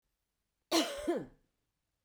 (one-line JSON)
{"cough_length": "2.0 s", "cough_amplitude": 4955, "cough_signal_mean_std_ratio": 0.37, "survey_phase": "beta (2021-08-13 to 2022-03-07)", "age": "65+", "gender": "Female", "wearing_mask": "No", "symptom_none": true, "smoker_status": "Ex-smoker", "respiratory_condition_asthma": false, "respiratory_condition_other": false, "recruitment_source": "REACT", "submission_delay": "1 day", "covid_test_result": "Negative", "covid_test_method": "RT-qPCR"}